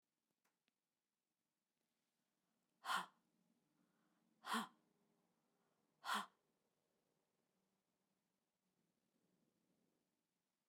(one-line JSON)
{"exhalation_length": "10.7 s", "exhalation_amplitude": 1147, "exhalation_signal_mean_std_ratio": 0.2, "survey_phase": "beta (2021-08-13 to 2022-03-07)", "age": "45-64", "gender": "Female", "wearing_mask": "No", "symptom_none": true, "smoker_status": "Never smoked", "respiratory_condition_asthma": false, "respiratory_condition_other": false, "recruitment_source": "REACT", "submission_delay": "8 days", "covid_test_result": "Negative", "covid_test_method": "RT-qPCR"}